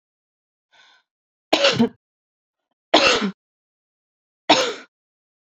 three_cough_length: 5.5 s
three_cough_amplitude: 30544
three_cough_signal_mean_std_ratio: 0.31
survey_phase: beta (2021-08-13 to 2022-03-07)
age: 18-44
gender: Female
wearing_mask: 'No'
symptom_prefer_not_to_say: true
smoker_status: Ex-smoker
respiratory_condition_asthma: false
respiratory_condition_other: false
recruitment_source: REACT
submission_delay: 2 days
covid_test_result: Negative
covid_test_method: RT-qPCR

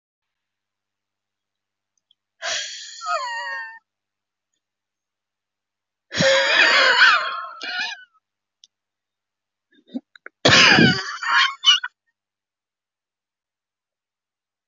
exhalation_length: 14.7 s
exhalation_amplitude: 30499
exhalation_signal_mean_std_ratio: 0.36
survey_phase: beta (2021-08-13 to 2022-03-07)
age: 45-64
gender: Female
wearing_mask: 'No'
symptom_cough_any: true
symptom_shortness_of_breath: true
symptom_abdominal_pain: true
symptom_fatigue: true
symptom_headache: true
symptom_other: true
symptom_onset: 13 days
smoker_status: Ex-smoker
respiratory_condition_asthma: true
respiratory_condition_other: false
recruitment_source: REACT
submission_delay: 1 day
covid_test_result: Negative
covid_test_method: RT-qPCR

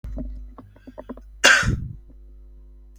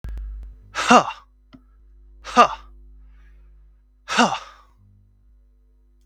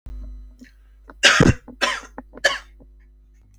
cough_length: 3.0 s
cough_amplitude: 32768
cough_signal_mean_std_ratio: 0.41
exhalation_length: 6.1 s
exhalation_amplitude: 32768
exhalation_signal_mean_std_ratio: 0.3
three_cough_length: 3.6 s
three_cough_amplitude: 32766
three_cough_signal_mean_std_ratio: 0.36
survey_phase: beta (2021-08-13 to 2022-03-07)
age: 18-44
gender: Male
wearing_mask: 'No'
symptom_cough_any: true
symptom_onset: 2 days
smoker_status: Never smoked
respiratory_condition_asthma: false
respiratory_condition_other: false
recruitment_source: Test and Trace
submission_delay: 1 day
covid_test_result: Negative
covid_test_method: RT-qPCR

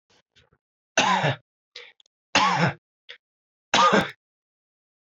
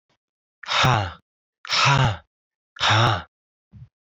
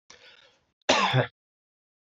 three_cough_length: 5.0 s
three_cough_amplitude: 17330
three_cough_signal_mean_std_ratio: 0.38
exhalation_length: 4.0 s
exhalation_amplitude: 21667
exhalation_signal_mean_std_ratio: 0.48
cough_length: 2.1 s
cough_amplitude: 16073
cough_signal_mean_std_ratio: 0.34
survey_phase: beta (2021-08-13 to 2022-03-07)
age: 18-44
gender: Male
wearing_mask: 'No'
symptom_cough_any: true
symptom_runny_or_blocked_nose: true
symptom_shortness_of_breath: true
symptom_fatigue: true
symptom_headache: true
symptom_change_to_sense_of_smell_or_taste: true
symptom_other: true
smoker_status: Never smoked
respiratory_condition_asthma: false
respiratory_condition_other: false
recruitment_source: Test and Trace
submission_delay: 2 days
covid_test_result: Positive
covid_test_method: RT-qPCR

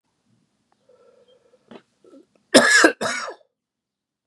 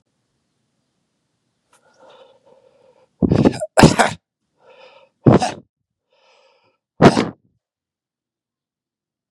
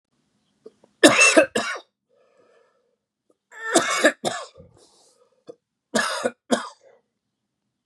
cough_length: 4.3 s
cough_amplitude: 32767
cough_signal_mean_std_ratio: 0.27
exhalation_length: 9.3 s
exhalation_amplitude: 32768
exhalation_signal_mean_std_ratio: 0.25
three_cough_length: 7.9 s
three_cough_amplitude: 32768
three_cough_signal_mean_std_ratio: 0.32
survey_phase: beta (2021-08-13 to 2022-03-07)
age: 18-44
gender: Male
wearing_mask: 'No'
symptom_cough_any: true
symptom_runny_or_blocked_nose: true
symptom_diarrhoea: true
symptom_fatigue: true
symptom_fever_high_temperature: true
symptom_onset: 3 days
smoker_status: Never smoked
respiratory_condition_asthma: false
respiratory_condition_other: false
recruitment_source: Test and Trace
submission_delay: 2 days
covid_test_result: Positive
covid_test_method: RT-qPCR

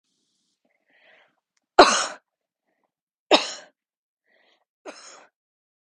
three_cough_length: 5.8 s
three_cough_amplitude: 32767
three_cough_signal_mean_std_ratio: 0.18
survey_phase: beta (2021-08-13 to 2022-03-07)
age: 18-44
gender: Female
wearing_mask: 'No'
symptom_none: true
smoker_status: Never smoked
respiratory_condition_asthma: false
respiratory_condition_other: false
recruitment_source: REACT
submission_delay: 9 days
covid_test_result: Negative
covid_test_method: RT-qPCR
influenza_a_test_result: Negative
influenza_b_test_result: Negative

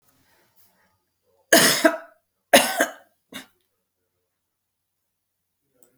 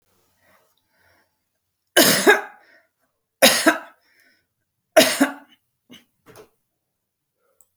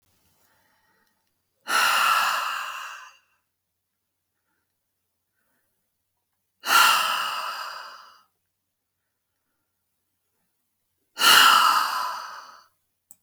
cough_length: 6.0 s
cough_amplitude: 32754
cough_signal_mean_std_ratio: 0.25
three_cough_length: 7.8 s
three_cough_amplitude: 32768
three_cough_signal_mean_std_ratio: 0.28
exhalation_length: 13.2 s
exhalation_amplitude: 23873
exhalation_signal_mean_std_ratio: 0.36
survey_phase: beta (2021-08-13 to 2022-03-07)
age: 45-64
gender: Female
wearing_mask: 'No'
symptom_none: true
smoker_status: Never smoked
respiratory_condition_asthma: false
respiratory_condition_other: false
recruitment_source: REACT
submission_delay: 3 days
covid_test_result: Negative
covid_test_method: RT-qPCR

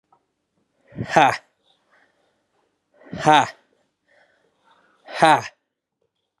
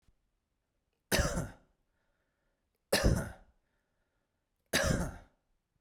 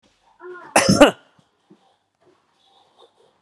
exhalation_length: 6.4 s
exhalation_amplitude: 32767
exhalation_signal_mean_std_ratio: 0.26
three_cough_length: 5.8 s
three_cough_amplitude: 6589
three_cough_signal_mean_std_ratio: 0.34
cough_length: 3.4 s
cough_amplitude: 32767
cough_signal_mean_std_ratio: 0.24
survey_phase: beta (2021-08-13 to 2022-03-07)
age: 18-44
gender: Male
wearing_mask: 'No'
symptom_none: true
smoker_status: Never smoked
respiratory_condition_asthma: false
respiratory_condition_other: false
recruitment_source: REACT
submission_delay: 2 days
covid_test_result: Negative
covid_test_method: RT-qPCR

